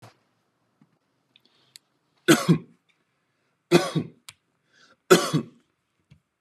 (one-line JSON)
{"three_cough_length": "6.4 s", "three_cough_amplitude": 28904, "three_cough_signal_mean_std_ratio": 0.25, "survey_phase": "beta (2021-08-13 to 2022-03-07)", "age": "18-44", "gender": "Male", "wearing_mask": "No", "symptom_none": true, "smoker_status": "Ex-smoker", "respiratory_condition_asthma": false, "respiratory_condition_other": false, "recruitment_source": "REACT", "submission_delay": "0 days", "covid_test_result": "Negative", "covid_test_method": "RT-qPCR", "influenza_a_test_result": "Negative", "influenza_b_test_result": "Negative"}